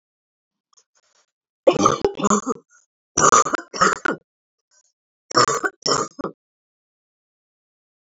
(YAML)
three_cough_length: 8.2 s
three_cough_amplitude: 30491
three_cough_signal_mean_std_ratio: 0.34
survey_phase: beta (2021-08-13 to 2022-03-07)
age: 18-44
gender: Female
wearing_mask: 'No'
symptom_cough_any: true
symptom_runny_or_blocked_nose: true
symptom_fatigue: true
symptom_fever_high_temperature: true
symptom_headache: true
symptom_change_to_sense_of_smell_or_taste: true
symptom_loss_of_taste: true
smoker_status: Never smoked
respiratory_condition_asthma: false
respiratory_condition_other: false
recruitment_source: Test and Trace
submission_delay: 1 day
covid_test_result: Positive
covid_test_method: LFT